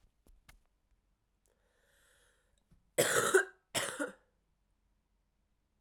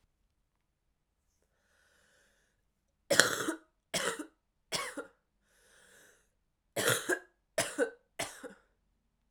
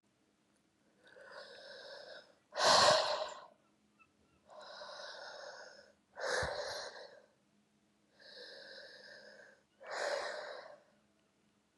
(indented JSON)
{
  "cough_length": "5.8 s",
  "cough_amplitude": 6764,
  "cough_signal_mean_std_ratio": 0.27,
  "three_cough_length": "9.3 s",
  "three_cough_amplitude": 26794,
  "three_cough_signal_mean_std_ratio": 0.3,
  "exhalation_length": "11.8 s",
  "exhalation_amplitude": 5839,
  "exhalation_signal_mean_std_ratio": 0.36,
  "survey_phase": "beta (2021-08-13 to 2022-03-07)",
  "age": "18-44",
  "gender": "Female",
  "wearing_mask": "No",
  "symptom_cough_any": true,
  "symptom_new_continuous_cough": true,
  "symptom_runny_or_blocked_nose": true,
  "symptom_shortness_of_breath": true,
  "symptom_sore_throat": true,
  "symptom_headache": true,
  "symptom_onset": "2 days",
  "smoker_status": "Current smoker (1 to 10 cigarettes per day)",
  "respiratory_condition_asthma": true,
  "respiratory_condition_other": false,
  "recruitment_source": "Test and Trace",
  "submission_delay": "2 days",
  "covid_test_result": "Positive",
  "covid_test_method": "RT-qPCR",
  "covid_ct_value": 18.5,
  "covid_ct_gene": "ORF1ab gene"
}